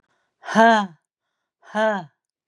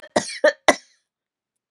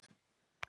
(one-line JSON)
{"exhalation_length": "2.5 s", "exhalation_amplitude": 28727, "exhalation_signal_mean_std_ratio": 0.38, "three_cough_length": "1.7 s", "three_cough_amplitude": 32767, "three_cough_signal_mean_std_ratio": 0.27, "cough_length": "0.7 s", "cough_amplitude": 3385, "cough_signal_mean_std_ratio": 0.15, "survey_phase": "beta (2021-08-13 to 2022-03-07)", "age": "65+", "gender": "Female", "wearing_mask": "No", "symptom_none": true, "smoker_status": "Never smoked", "respiratory_condition_asthma": false, "respiratory_condition_other": false, "recruitment_source": "REACT", "submission_delay": "3 days", "covid_test_result": "Negative", "covid_test_method": "RT-qPCR", "influenza_a_test_result": "Unknown/Void", "influenza_b_test_result": "Unknown/Void"}